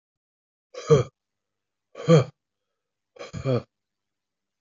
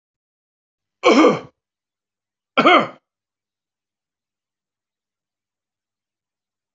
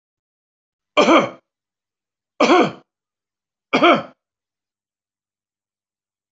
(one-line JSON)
{"exhalation_length": "4.6 s", "exhalation_amplitude": 20128, "exhalation_signal_mean_std_ratio": 0.25, "cough_length": "6.7 s", "cough_amplitude": 25306, "cough_signal_mean_std_ratio": 0.24, "three_cough_length": "6.3 s", "three_cough_amplitude": 25612, "three_cough_signal_mean_std_ratio": 0.29, "survey_phase": "alpha (2021-03-01 to 2021-08-12)", "age": "45-64", "gender": "Male", "wearing_mask": "No", "symptom_none": true, "smoker_status": "Never smoked", "respiratory_condition_asthma": false, "respiratory_condition_other": false, "recruitment_source": "REACT", "submission_delay": "2 days", "covid_test_result": "Negative", "covid_test_method": "RT-qPCR"}